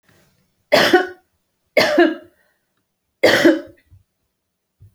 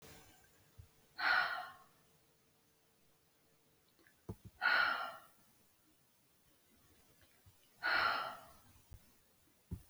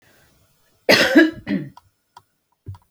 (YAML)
three_cough_length: 4.9 s
three_cough_amplitude: 30333
three_cough_signal_mean_std_ratio: 0.37
exhalation_length: 9.9 s
exhalation_amplitude: 2852
exhalation_signal_mean_std_ratio: 0.35
cough_length: 2.9 s
cough_amplitude: 29991
cough_signal_mean_std_ratio: 0.35
survey_phase: beta (2021-08-13 to 2022-03-07)
age: 45-64
gender: Female
wearing_mask: 'No'
symptom_sore_throat: true
smoker_status: Never smoked
respiratory_condition_asthma: false
respiratory_condition_other: false
recruitment_source: Test and Trace
submission_delay: 2 days
covid_test_result: Positive
covid_test_method: RT-qPCR
covid_ct_value: 33.8
covid_ct_gene: ORF1ab gene
covid_ct_mean: 34.3
covid_viral_load: 5.5 copies/ml
covid_viral_load_category: Minimal viral load (< 10K copies/ml)